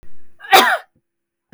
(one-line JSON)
{"cough_length": "1.5 s", "cough_amplitude": 32768, "cough_signal_mean_std_ratio": 0.43, "survey_phase": "beta (2021-08-13 to 2022-03-07)", "age": "45-64", "gender": "Female", "wearing_mask": "No", "symptom_none": true, "smoker_status": "Never smoked", "respiratory_condition_asthma": false, "respiratory_condition_other": false, "recruitment_source": "REACT", "submission_delay": "3 days", "covid_test_result": "Negative", "covid_test_method": "RT-qPCR", "influenza_a_test_result": "Negative", "influenza_b_test_result": "Negative"}